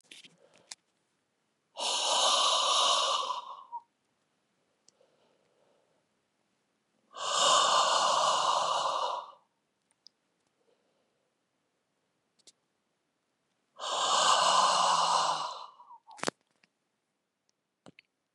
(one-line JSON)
{"exhalation_length": "18.3 s", "exhalation_amplitude": 9375, "exhalation_signal_mean_std_ratio": 0.47, "survey_phase": "beta (2021-08-13 to 2022-03-07)", "age": "65+", "gender": "Male", "wearing_mask": "No", "symptom_cough_any": true, "symptom_runny_or_blocked_nose": true, "smoker_status": "Ex-smoker", "respiratory_condition_asthma": false, "respiratory_condition_other": false, "recruitment_source": "REACT", "submission_delay": "1 day", "covid_test_result": "Negative", "covid_test_method": "RT-qPCR", "influenza_a_test_result": "Negative", "influenza_b_test_result": "Negative"}